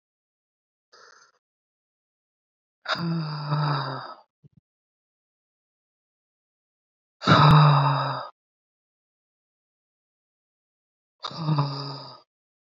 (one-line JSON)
{"exhalation_length": "12.6 s", "exhalation_amplitude": 23595, "exhalation_signal_mean_std_ratio": 0.32, "survey_phase": "beta (2021-08-13 to 2022-03-07)", "age": "18-44", "gender": "Female", "wearing_mask": "No", "symptom_cough_any": true, "symptom_runny_or_blocked_nose": true, "symptom_sore_throat": true, "symptom_fatigue": true, "symptom_fever_high_temperature": true, "symptom_headache": true, "symptom_other": true, "symptom_onset": "3 days", "smoker_status": "Ex-smoker", "respiratory_condition_asthma": false, "respiratory_condition_other": false, "recruitment_source": "Test and Trace", "submission_delay": "2 days", "covid_test_result": "Positive", "covid_test_method": "ePCR"}